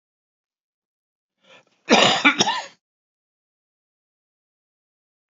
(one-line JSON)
{"cough_length": "5.3 s", "cough_amplitude": 28455, "cough_signal_mean_std_ratio": 0.25, "survey_phase": "beta (2021-08-13 to 2022-03-07)", "age": "18-44", "gender": "Female", "wearing_mask": "No", "symptom_cough_any": true, "symptom_runny_or_blocked_nose": true, "symptom_shortness_of_breath": true, "symptom_sore_throat": true, "symptom_diarrhoea": true, "symptom_fatigue": true, "symptom_headache": true, "smoker_status": "Ex-smoker", "respiratory_condition_asthma": false, "respiratory_condition_other": false, "recruitment_source": "Test and Trace", "submission_delay": "10 days", "covid_test_result": "Negative", "covid_test_method": "RT-qPCR"}